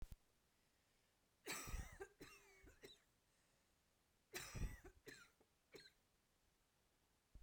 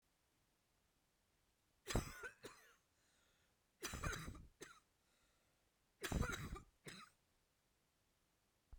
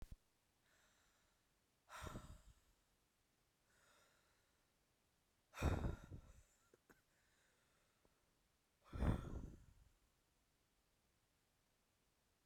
{
  "cough_length": "7.4 s",
  "cough_amplitude": 471,
  "cough_signal_mean_std_ratio": 0.4,
  "three_cough_length": "8.8 s",
  "three_cough_amplitude": 1339,
  "three_cough_signal_mean_std_ratio": 0.34,
  "exhalation_length": "12.5 s",
  "exhalation_amplitude": 1612,
  "exhalation_signal_mean_std_ratio": 0.27,
  "survey_phase": "beta (2021-08-13 to 2022-03-07)",
  "age": "18-44",
  "gender": "Female",
  "wearing_mask": "No",
  "symptom_cough_any": true,
  "symptom_runny_or_blocked_nose": true,
  "symptom_shortness_of_breath": true,
  "symptom_abdominal_pain": true,
  "symptom_diarrhoea": true,
  "symptom_fatigue": true,
  "symptom_headache": true,
  "symptom_change_to_sense_of_smell_or_taste": true,
  "symptom_loss_of_taste": true,
  "symptom_onset": "3 days",
  "smoker_status": "Never smoked",
  "respiratory_condition_asthma": false,
  "respiratory_condition_other": false,
  "recruitment_source": "Test and Trace",
  "submission_delay": "2 days",
  "covid_test_result": "Positive",
  "covid_test_method": "RT-qPCR",
  "covid_ct_value": 21.0,
  "covid_ct_gene": "ORF1ab gene"
}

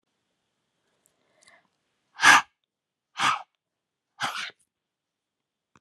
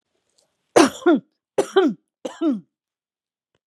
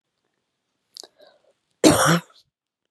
{
  "exhalation_length": "5.8 s",
  "exhalation_amplitude": 28340,
  "exhalation_signal_mean_std_ratio": 0.21,
  "three_cough_length": "3.7 s",
  "three_cough_amplitude": 30829,
  "three_cough_signal_mean_std_ratio": 0.35,
  "cough_length": "2.9 s",
  "cough_amplitude": 32281,
  "cough_signal_mean_std_ratio": 0.28,
  "survey_phase": "beta (2021-08-13 to 2022-03-07)",
  "age": "45-64",
  "gender": "Female",
  "wearing_mask": "No",
  "symptom_runny_or_blocked_nose": true,
  "symptom_sore_throat": true,
  "symptom_fatigue": true,
  "symptom_headache": true,
  "symptom_onset": "5 days",
  "smoker_status": "Never smoked",
  "respiratory_condition_asthma": false,
  "respiratory_condition_other": false,
  "recruitment_source": "Test and Trace",
  "submission_delay": "1 day",
  "covid_test_result": "Positive",
  "covid_test_method": "RT-qPCR"
}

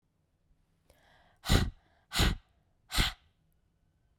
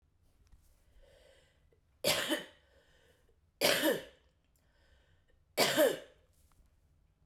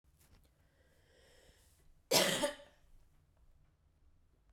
{
  "exhalation_length": "4.2 s",
  "exhalation_amplitude": 10772,
  "exhalation_signal_mean_std_ratio": 0.3,
  "three_cough_length": "7.3 s",
  "three_cough_amplitude": 7861,
  "three_cough_signal_mean_std_ratio": 0.33,
  "cough_length": "4.5 s",
  "cough_amplitude": 5606,
  "cough_signal_mean_std_ratio": 0.27,
  "survey_phase": "beta (2021-08-13 to 2022-03-07)",
  "age": "18-44",
  "gender": "Female",
  "wearing_mask": "No",
  "symptom_cough_any": true,
  "symptom_onset": "8 days",
  "smoker_status": "Ex-smoker",
  "respiratory_condition_asthma": false,
  "respiratory_condition_other": false,
  "recruitment_source": "REACT",
  "submission_delay": "2 days",
  "covid_test_result": "Negative",
  "covid_test_method": "RT-qPCR",
  "influenza_a_test_result": "Negative",
  "influenza_b_test_result": "Negative"
}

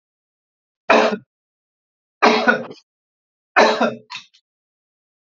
{
  "three_cough_length": "5.2 s",
  "three_cough_amplitude": 32161,
  "three_cough_signal_mean_std_ratio": 0.34,
  "survey_phase": "beta (2021-08-13 to 2022-03-07)",
  "age": "45-64",
  "gender": "Male",
  "wearing_mask": "No",
  "symptom_none": true,
  "smoker_status": "Ex-smoker",
  "respiratory_condition_asthma": false,
  "respiratory_condition_other": false,
  "recruitment_source": "REACT",
  "submission_delay": "10 days",
  "covid_test_result": "Negative",
  "covid_test_method": "RT-qPCR"
}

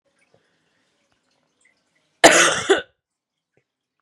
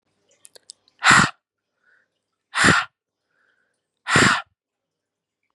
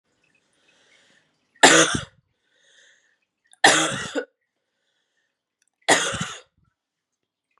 {
  "cough_length": "4.0 s",
  "cough_amplitude": 32768,
  "cough_signal_mean_std_ratio": 0.25,
  "exhalation_length": "5.5 s",
  "exhalation_amplitude": 31564,
  "exhalation_signal_mean_std_ratio": 0.3,
  "three_cough_length": "7.6 s",
  "three_cough_amplitude": 32767,
  "three_cough_signal_mean_std_ratio": 0.27,
  "survey_phase": "beta (2021-08-13 to 2022-03-07)",
  "age": "18-44",
  "gender": "Female",
  "wearing_mask": "No",
  "symptom_cough_any": true,
  "symptom_runny_or_blocked_nose": true,
  "symptom_sore_throat": true,
  "symptom_fatigue": true,
  "smoker_status": "Never smoked",
  "respiratory_condition_asthma": false,
  "respiratory_condition_other": false,
  "recruitment_source": "Test and Trace",
  "submission_delay": "2 days",
  "covid_test_result": "Positive",
  "covid_test_method": "LFT"
}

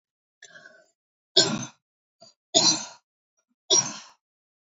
{
  "three_cough_length": "4.7 s",
  "three_cough_amplitude": 26670,
  "three_cough_signal_mean_std_ratio": 0.3,
  "survey_phase": "beta (2021-08-13 to 2022-03-07)",
  "age": "65+",
  "gender": "Female",
  "wearing_mask": "No",
  "symptom_none": true,
  "smoker_status": "Never smoked",
  "respiratory_condition_asthma": false,
  "respiratory_condition_other": false,
  "recruitment_source": "REACT",
  "submission_delay": "1 day",
  "covid_test_result": "Negative",
  "covid_test_method": "RT-qPCR",
  "influenza_a_test_result": "Negative",
  "influenza_b_test_result": "Negative"
}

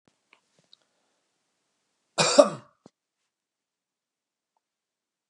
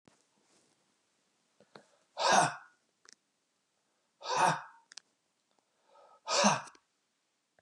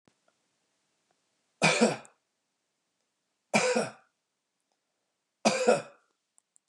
{
  "cough_length": "5.3 s",
  "cough_amplitude": 30580,
  "cough_signal_mean_std_ratio": 0.16,
  "exhalation_length": "7.6 s",
  "exhalation_amplitude": 8247,
  "exhalation_signal_mean_std_ratio": 0.29,
  "three_cough_length": "6.7 s",
  "three_cough_amplitude": 11948,
  "three_cough_signal_mean_std_ratio": 0.3,
  "survey_phase": "beta (2021-08-13 to 2022-03-07)",
  "age": "45-64",
  "gender": "Male",
  "wearing_mask": "No",
  "symptom_none": true,
  "smoker_status": "Never smoked",
  "respiratory_condition_asthma": false,
  "respiratory_condition_other": false,
  "recruitment_source": "REACT",
  "submission_delay": "1 day",
  "covid_test_result": "Negative",
  "covid_test_method": "RT-qPCR",
  "influenza_a_test_result": "Negative",
  "influenza_b_test_result": "Negative"
}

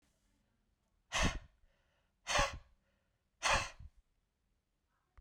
{
  "exhalation_length": "5.2 s",
  "exhalation_amplitude": 3889,
  "exhalation_signal_mean_std_ratio": 0.31,
  "survey_phase": "beta (2021-08-13 to 2022-03-07)",
  "age": "18-44",
  "gender": "Male",
  "wearing_mask": "No",
  "symptom_none": true,
  "smoker_status": "Never smoked",
  "respiratory_condition_asthma": false,
  "respiratory_condition_other": false,
  "recruitment_source": "Test and Trace",
  "submission_delay": "0 days",
  "covid_test_result": "Negative",
  "covid_test_method": "LFT"
}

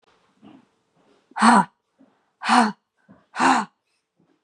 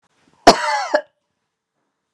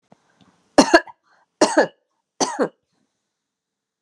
{
  "exhalation_length": "4.4 s",
  "exhalation_amplitude": 31513,
  "exhalation_signal_mean_std_ratio": 0.33,
  "cough_length": "2.1 s",
  "cough_amplitude": 32768,
  "cough_signal_mean_std_ratio": 0.29,
  "three_cough_length": "4.0 s",
  "three_cough_amplitude": 32767,
  "three_cough_signal_mean_std_ratio": 0.27,
  "survey_phase": "beta (2021-08-13 to 2022-03-07)",
  "age": "18-44",
  "gender": "Female",
  "wearing_mask": "No",
  "symptom_none": true,
  "smoker_status": "Never smoked",
  "respiratory_condition_asthma": false,
  "respiratory_condition_other": false,
  "recruitment_source": "REACT",
  "submission_delay": "1 day",
  "covid_test_result": "Negative",
  "covid_test_method": "RT-qPCR"
}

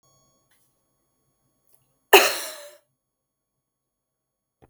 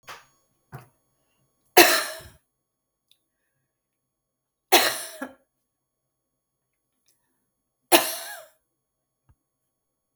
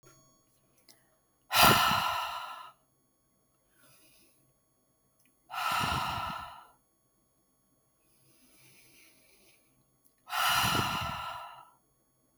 {
  "cough_length": "4.7 s",
  "cough_amplitude": 32768,
  "cough_signal_mean_std_ratio": 0.17,
  "three_cough_length": "10.2 s",
  "three_cough_amplitude": 32766,
  "three_cough_signal_mean_std_ratio": 0.2,
  "exhalation_length": "12.4 s",
  "exhalation_amplitude": 14856,
  "exhalation_signal_mean_std_ratio": 0.37,
  "survey_phase": "beta (2021-08-13 to 2022-03-07)",
  "age": "45-64",
  "gender": "Female",
  "wearing_mask": "No",
  "symptom_none": true,
  "smoker_status": "Never smoked",
  "respiratory_condition_asthma": false,
  "respiratory_condition_other": false,
  "recruitment_source": "REACT",
  "submission_delay": "1 day",
  "covid_test_result": "Negative",
  "covid_test_method": "RT-qPCR",
  "influenza_a_test_result": "Negative",
  "influenza_b_test_result": "Negative"
}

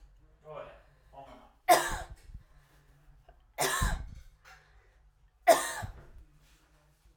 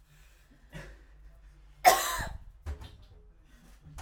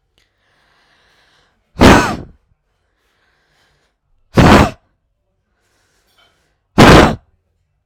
{
  "three_cough_length": "7.2 s",
  "three_cough_amplitude": 12513,
  "three_cough_signal_mean_std_ratio": 0.31,
  "cough_length": "4.0 s",
  "cough_amplitude": 16802,
  "cough_signal_mean_std_ratio": 0.3,
  "exhalation_length": "7.9 s",
  "exhalation_amplitude": 32768,
  "exhalation_signal_mean_std_ratio": 0.3,
  "survey_phase": "alpha (2021-03-01 to 2021-08-12)",
  "age": "18-44",
  "gender": "Female",
  "wearing_mask": "No",
  "symptom_none": true,
  "smoker_status": "Current smoker (1 to 10 cigarettes per day)",
  "respiratory_condition_asthma": false,
  "respiratory_condition_other": false,
  "recruitment_source": "REACT",
  "submission_delay": "2 days",
  "covid_test_result": "Negative",
  "covid_test_method": "RT-qPCR"
}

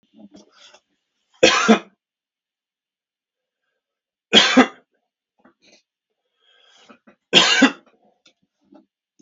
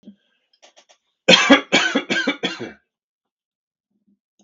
{
  "three_cough_length": "9.2 s",
  "three_cough_amplitude": 32768,
  "three_cough_signal_mean_std_ratio": 0.26,
  "cough_length": "4.4 s",
  "cough_amplitude": 32768,
  "cough_signal_mean_std_ratio": 0.33,
  "survey_phase": "beta (2021-08-13 to 2022-03-07)",
  "age": "45-64",
  "gender": "Male",
  "wearing_mask": "No",
  "symptom_none": true,
  "smoker_status": "Never smoked",
  "respiratory_condition_asthma": false,
  "respiratory_condition_other": false,
  "recruitment_source": "REACT",
  "submission_delay": "1 day",
  "covid_test_result": "Negative",
  "covid_test_method": "RT-qPCR",
  "influenza_a_test_result": "Negative",
  "influenza_b_test_result": "Negative"
}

